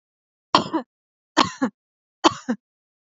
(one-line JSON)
{"three_cough_length": "3.1 s", "three_cough_amplitude": 28715, "three_cough_signal_mean_std_ratio": 0.28, "survey_phase": "beta (2021-08-13 to 2022-03-07)", "age": "18-44", "gender": "Female", "wearing_mask": "No", "symptom_none": true, "smoker_status": "Never smoked", "respiratory_condition_asthma": false, "respiratory_condition_other": false, "recruitment_source": "REACT", "submission_delay": "1 day", "covid_test_result": "Negative", "covid_test_method": "RT-qPCR"}